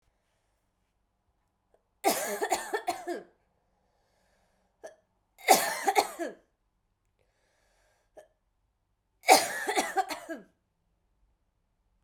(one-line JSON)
{"three_cough_length": "12.0 s", "three_cough_amplitude": 19623, "three_cough_signal_mean_std_ratio": 0.29, "survey_phase": "beta (2021-08-13 to 2022-03-07)", "age": "18-44", "gender": "Female", "wearing_mask": "No", "symptom_cough_any": true, "symptom_runny_or_blocked_nose": true, "symptom_headache": true, "symptom_change_to_sense_of_smell_or_taste": true, "symptom_loss_of_taste": true, "smoker_status": "Never smoked", "respiratory_condition_asthma": true, "respiratory_condition_other": false, "recruitment_source": "Test and Trace", "submission_delay": "2 days", "covid_test_result": "Positive", "covid_test_method": "LAMP"}